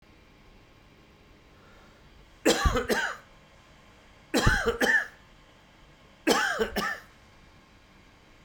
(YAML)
three_cough_length: 8.4 s
three_cough_amplitude: 12560
three_cough_signal_mean_std_ratio: 0.41
survey_phase: beta (2021-08-13 to 2022-03-07)
age: 45-64
gender: Male
wearing_mask: 'No'
symptom_none: true
symptom_onset: 13 days
smoker_status: Ex-smoker
respiratory_condition_asthma: false
respiratory_condition_other: false
recruitment_source: REACT
submission_delay: 1 day
covid_test_result: Negative
covid_test_method: RT-qPCR